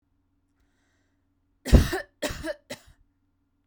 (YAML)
three_cough_length: 3.7 s
three_cough_amplitude: 29437
three_cough_signal_mean_std_ratio: 0.23
survey_phase: beta (2021-08-13 to 2022-03-07)
age: 18-44
gender: Female
wearing_mask: 'No'
symptom_none: true
smoker_status: Ex-smoker
respiratory_condition_asthma: false
respiratory_condition_other: false
recruitment_source: REACT
submission_delay: 1 day
covid_test_result: Negative
covid_test_method: RT-qPCR